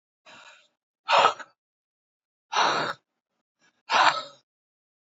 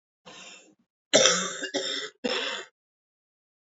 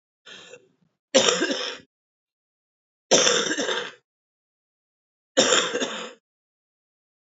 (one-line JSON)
{"exhalation_length": "5.1 s", "exhalation_amplitude": 27830, "exhalation_signal_mean_std_ratio": 0.33, "cough_length": "3.7 s", "cough_amplitude": 26394, "cough_signal_mean_std_ratio": 0.4, "three_cough_length": "7.3 s", "three_cough_amplitude": 25046, "three_cough_signal_mean_std_ratio": 0.38, "survey_phase": "beta (2021-08-13 to 2022-03-07)", "age": "45-64", "gender": "Female", "wearing_mask": "No", "symptom_cough_any": true, "symptom_runny_or_blocked_nose": true, "symptom_sore_throat": true, "symptom_fatigue": true, "symptom_fever_high_temperature": true, "symptom_headache": true, "symptom_change_to_sense_of_smell_or_taste": true, "symptom_onset": "2 days", "smoker_status": "Current smoker (e-cigarettes or vapes only)", "respiratory_condition_asthma": false, "respiratory_condition_other": false, "recruitment_source": "Test and Trace", "submission_delay": "1 day", "covid_test_result": "Positive", "covid_test_method": "ePCR"}